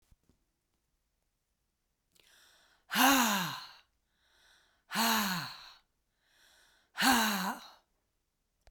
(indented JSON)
{
  "exhalation_length": "8.7 s",
  "exhalation_amplitude": 7604,
  "exhalation_signal_mean_std_ratio": 0.36,
  "survey_phase": "beta (2021-08-13 to 2022-03-07)",
  "age": "45-64",
  "gender": "Female",
  "wearing_mask": "No",
  "symptom_cough_any": true,
  "symptom_runny_or_blocked_nose": true,
  "symptom_diarrhoea": true,
  "symptom_onset": "6 days",
  "smoker_status": "Never smoked",
  "respiratory_condition_asthma": false,
  "respiratory_condition_other": false,
  "recruitment_source": "Test and Trace",
  "submission_delay": "2 days",
  "covid_test_result": "Positive",
  "covid_test_method": "RT-qPCR"
}